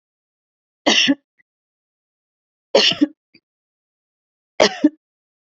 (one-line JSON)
{"three_cough_length": "5.5 s", "three_cough_amplitude": 30969, "three_cough_signal_mean_std_ratio": 0.28, "survey_phase": "beta (2021-08-13 to 2022-03-07)", "age": "45-64", "gender": "Female", "wearing_mask": "No", "symptom_headache": true, "smoker_status": "Ex-smoker", "respiratory_condition_asthma": false, "respiratory_condition_other": false, "recruitment_source": "REACT", "submission_delay": "3 days", "covid_test_result": "Negative", "covid_test_method": "RT-qPCR", "influenza_a_test_result": "Negative", "influenza_b_test_result": "Negative"}